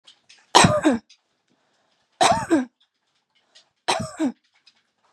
{"three_cough_length": "5.1 s", "three_cough_amplitude": 32647, "three_cough_signal_mean_std_ratio": 0.35, "survey_phase": "beta (2021-08-13 to 2022-03-07)", "age": "18-44", "gender": "Female", "wearing_mask": "No", "symptom_cough_any": true, "symptom_runny_or_blocked_nose": true, "symptom_sore_throat": true, "symptom_fatigue": true, "symptom_fever_high_temperature": true, "smoker_status": "Never smoked", "respiratory_condition_asthma": false, "respiratory_condition_other": false, "recruitment_source": "Test and Trace", "submission_delay": "2 days", "covid_test_result": "Positive", "covid_test_method": "RT-qPCR", "covid_ct_value": 16.5, "covid_ct_gene": "ORF1ab gene"}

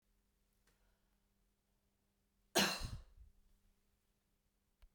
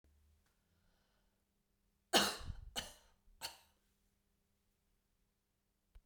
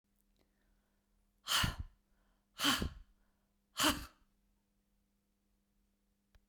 {"cough_length": "4.9 s", "cough_amplitude": 3671, "cough_signal_mean_std_ratio": 0.22, "three_cough_length": "6.1 s", "three_cough_amplitude": 5217, "three_cough_signal_mean_std_ratio": 0.21, "exhalation_length": "6.5 s", "exhalation_amplitude": 3987, "exhalation_signal_mean_std_ratio": 0.29, "survey_phase": "beta (2021-08-13 to 2022-03-07)", "age": "65+", "gender": "Female", "wearing_mask": "No", "symptom_none": true, "smoker_status": "Never smoked", "respiratory_condition_asthma": false, "respiratory_condition_other": false, "recruitment_source": "REACT", "submission_delay": "2 days", "covid_test_result": "Negative", "covid_test_method": "RT-qPCR"}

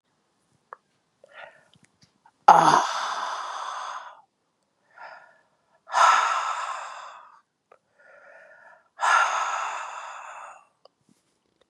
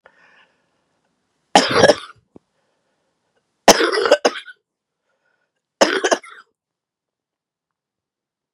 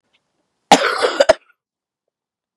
{"exhalation_length": "11.7 s", "exhalation_amplitude": 32385, "exhalation_signal_mean_std_ratio": 0.36, "three_cough_length": "8.5 s", "three_cough_amplitude": 32768, "three_cough_signal_mean_std_ratio": 0.27, "cough_length": "2.6 s", "cough_amplitude": 32768, "cough_signal_mean_std_ratio": 0.3, "survey_phase": "beta (2021-08-13 to 2022-03-07)", "age": "45-64", "gender": "Female", "wearing_mask": "No", "symptom_cough_any": true, "symptom_runny_or_blocked_nose": true, "symptom_fatigue": true, "symptom_headache": true, "smoker_status": "Never smoked", "respiratory_condition_asthma": false, "respiratory_condition_other": false, "recruitment_source": "Test and Trace", "submission_delay": "2 days", "covid_test_result": "Positive", "covid_test_method": "LFT"}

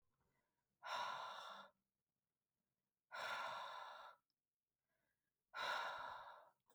{"exhalation_length": "6.7 s", "exhalation_amplitude": 660, "exhalation_signal_mean_std_ratio": 0.51, "survey_phase": "beta (2021-08-13 to 2022-03-07)", "age": "18-44", "gender": "Female", "wearing_mask": "No", "symptom_none": true, "smoker_status": "Never smoked", "respiratory_condition_asthma": false, "respiratory_condition_other": false, "recruitment_source": "REACT", "submission_delay": "1 day", "covid_test_result": "Negative", "covid_test_method": "RT-qPCR"}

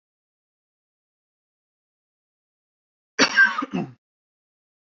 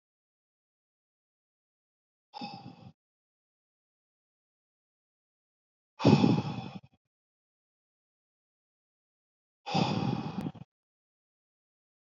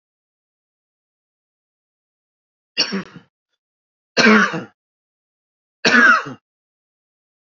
{"cough_length": "4.9 s", "cough_amplitude": 21695, "cough_signal_mean_std_ratio": 0.23, "exhalation_length": "12.0 s", "exhalation_amplitude": 11404, "exhalation_signal_mean_std_ratio": 0.24, "three_cough_length": "7.5 s", "three_cough_amplitude": 29233, "three_cough_signal_mean_std_ratio": 0.28, "survey_phase": "beta (2021-08-13 to 2022-03-07)", "age": "18-44", "gender": "Male", "wearing_mask": "No", "symptom_cough_any": true, "symptom_fatigue": true, "symptom_onset": "2 days", "smoker_status": "Never smoked", "respiratory_condition_asthma": false, "respiratory_condition_other": false, "recruitment_source": "Test and Trace", "submission_delay": "1 day", "covid_test_result": "Positive", "covid_test_method": "RT-qPCR", "covid_ct_value": 33.7, "covid_ct_gene": "ORF1ab gene"}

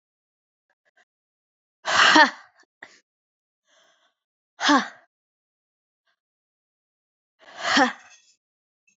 {"exhalation_length": "9.0 s", "exhalation_amplitude": 26790, "exhalation_signal_mean_std_ratio": 0.24, "survey_phase": "beta (2021-08-13 to 2022-03-07)", "age": "18-44", "gender": "Female", "wearing_mask": "No", "symptom_cough_any": true, "symptom_runny_or_blocked_nose": true, "symptom_sore_throat": true, "symptom_fatigue": true, "symptom_headache": true, "smoker_status": "Never smoked", "respiratory_condition_asthma": false, "respiratory_condition_other": false, "recruitment_source": "Test and Trace", "submission_delay": "2 days", "covid_test_result": "Positive", "covid_test_method": "RT-qPCR", "covid_ct_value": 27.3, "covid_ct_gene": "ORF1ab gene"}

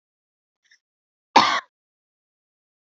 {"cough_length": "3.0 s", "cough_amplitude": 28342, "cough_signal_mean_std_ratio": 0.19, "survey_phase": "alpha (2021-03-01 to 2021-08-12)", "age": "18-44", "gender": "Female", "wearing_mask": "No", "symptom_fatigue": true, "smoker_status": "Never smoked", "respiratory_condition_asthma": true, "respiratory_condition_other": false, "recruitment_source": "Test and Trace", "submission_delay": "2 days", "covid_test_result": "Positive", "covid_test_method": "RT-qPCR", "covid_ct_value": 23.5, "covid_ct_gene": "ORF1ab gene", "covid_ct_mean": 23.8, "covid_viral_load": "16000 copies/ml", "covid_viral_load_category": "Low viral load (10K-1M copies/ml)"}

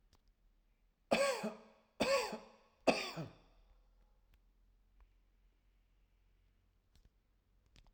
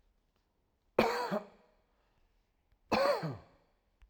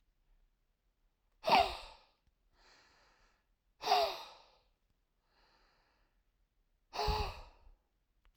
{"three_cough_length": "7.9 s", "three_cough_amplitude": 6030, "three_cough_signal_mean_std_ratio": 0.3, "cough_length": "4.1 s", "cough_amplitude": 8608, "cough_signal_mean_std_ratio": 0.36, "exhalation_length": "8.4 s", "exhalation_amplitude": 7389, "exhalation_signal_mean_std_ratio": 0.28, "survey_phase": "alpha (2021-03-01 to 2021-08-12)", "age": "18-44", "gender": "Male", "wearing_mask": "No", "symptom_none": true, "smoker_status": "Never smoked", "respiratory_condition_asthma": true, "respiratory_condition_other": false, "recruitment_source": "REACT", "submission_delay": "1 day", "covid_test_result": "Negative", "covid_test_method": "RT-qPCR"}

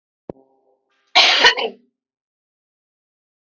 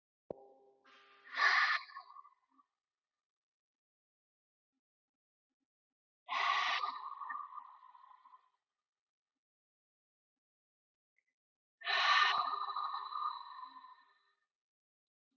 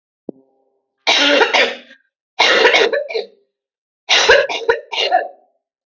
{"cough_length": "3.6 s", "cough_amplitude": 31804, "cough_signal_mean_std_ratio": 0.28, "exhalation_length": "15.4 s", "exhalation_amplitude": 4142, "exhalation_signal_mean_std_ratio": 0.35, "three_cough_length": "5.9 s", "three_cough_amplitude": 31016, "three_cough_signal_mean_std_ratio": 0.52, "survey_phase": "alpha (2021-03-01 to 2021-08-12)", "age": "18-44", "gender": "Female", "wearing_mask": "No", "symptom_none": true, "smoker_status": "Never smoked", "respiratory_condition_asthma": false, "respiratory_condition_other": false, "recruitment_source": "REACT", "submission_delay": "1 day", "covid_test_result": "Negative", "covid_test_method": "RT-qPCR"}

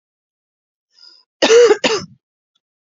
{"cough_length": "3.0 s", "cough_amplitude": 30986, "cough_signal_mean_std_ratio": 0.33, "survey_phase": "beta (2021-08-13 to 2022-03-07)", "age": "45-64", "gender": "Female", "wearing_mask": "No", "symptom_runny_or_blocked_nose": true, "symptom_sore_throat": true, "symptom_fatigue": true, "symptom_headache": true, "symptom_onset": "4 days", "smoker_status": "Ex-smoker", "respiratory_condition_asthma": false, "respiratory_condition_other": false, "recruitment_source": "Test and Trace", "submission_delay": "2 days", "covid_test_result": "Negative", "covid_test_method": "RT-qPCR"}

